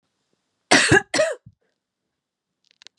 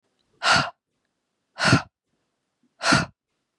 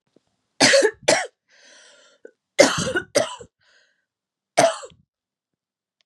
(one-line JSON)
{"cough_length": "3.0 s", "cough_amplitude": 32767, "cough_signal_mean_std_ratio": 0.31, "exhalation_length": "3.6 s", "exhalation_amplitude": 22735, "exhalation_signal_mean_std_ratio": 0.34, "three_cough_length": "6.1 s", "three_cough_amplitude": 32768, "three_cough_signal_mean_std_ratio": 0.33, "survey_phase": "beta (2021-08-13 to 2022-03-07)", "age": "18-44", "gender": "Female", "wearing_mask": "No", "symptom_none": true, "symptom_onset": "11 days", "smoker_status": "Never smoked", "respiratory_condition_asthma": false, "respiratory_condition_other": false, "recruitment_source": "REACT", "submission_delay": "1 day", "covid_test_result": "Negative", "covid_test_method": "RT-qPCR", "influenza_a_test_result": "Negative", "influenza_b_test_result": "Negative"}